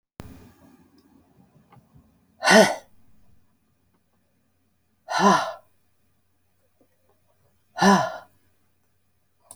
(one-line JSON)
{"exhalation_length": "9.6 s", "exhalation_amplitude": 25344, "exhalation_signal_mean_std_ratio": 0.26, "survey_phase": "alpha (2021-03-01 to 2021-08-12)", "age": "65+", "gender": "Female", "wearing_mask": "No", "symptom_none": true, "smoker_status": "Never smoked", "respiratory_condition_asthma": false, "respiratory_condition_other": false, "recruitment_source": "REACT", "submission_delay": "3 days", "covid_test_result": "Negative", "covid_test_method": "RT-qPCR"}